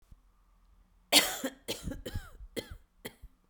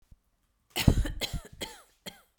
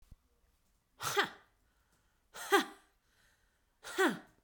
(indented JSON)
{
  "three_cough_length": "3.5 s",
  "three_cough_amplitude": 18250,
  "three_cough_signal_mean_std_ratio": 0.32,
  "cough_length": "2.4 s",
  "cough_amplitude": 19205,
  "cough_signal_mean_std_ratio": 0.32,
  "exhalation_length": "4.4 s",
  "exhalation_amplitude": 5791,
  "exhalation_signal_mean_std_ratio": 0.3,
  "survey_phase": "beta (2021-08-13 to 2022-03-07)",
  "age": "45-64",
  "gender": "Female",
  "wearing_mask": "Yes",
  "symptom_runny_or_blocked_nose": true,
  "symptom_shortness_of_breath": true,
  "symptom_sore_throat": true,
  "symptom_fatigue": true,
  "symptom_headache": true,
  "symptom_change_to_sense_of_smell_or_taste": true,
  "symptom_loss_of_taste": true,
  "smoker_status": "Ex-smoker",
  "respiratory_condition_asthma": false,
  "respiratory_condition_other": false,
  "recruitment_source": "Test and Trace",
  "submission_delay": "2 days",
  "covid_test_result": "Positive",
  "covid_test_method": "LFT"
}